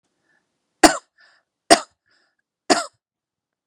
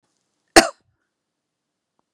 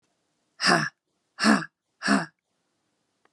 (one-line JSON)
{"three_cough_length": "3.7 s", "three_cough_amplitude": 32768, "three_cough_signal_mean_std_ratio": 0.19, "cough_length": "2.1 s", "cough_amplitude": 32768, "cough_signal_mean_std_ratio": 0.15, "exhalation_length": "3.3 s", "exhalation_amplitude": 19661, "exhalation_signal_mean_std_ratio": 0.35, "survey_phase": "beta (2021-08-13 to 2022-03-07)", "age": "45-64", "gender": "Female", "wearing_mask": "No", "symptom_cough_any": true, "symptom_abdominal_pain": true, "symptom_headache": true, "symptom_onset": "2 days", "smoker_status": "Never smoked", "respiratory_condition_asthma": false, "respiratory_condition_other": false, "recruitment_source": "Test and Trace", "submission_delay": "1 day", "covid_test_result": "Positive", "covid_test_method": "RT-qPCR"}